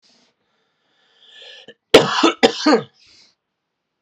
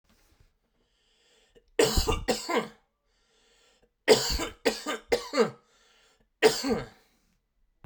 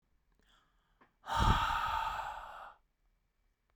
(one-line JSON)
{"cough_length": "4.0 s", "cough_amplitude": 32768, "cough_signal_mean_std_ratio": 0.29, "three_cough_length": "7.9 s", "three_cough_amplitude": 17177, "three_cough_signal_mean_std_ratio": 0.36, "exhalation_length": "3.8 s", "exhalation_amplitude": 5601, "exhalation_signal_mean_std_ratio": 0.44, "survey_phase": "beta (2021-08-13 to 2022-03-07)", "age": "18-44", "gender": "Male", "wearing_mask": "No", "symptom_none": true, "smoker_status": "Never smoked", "respiratory_condition_asthma": false, "respiratory_condition_other": false, "recruitment_source": "REACT", "submission_delay": "0 days", "covid_test_result": "Negative", "covid_test_method": "RT-qPCR"}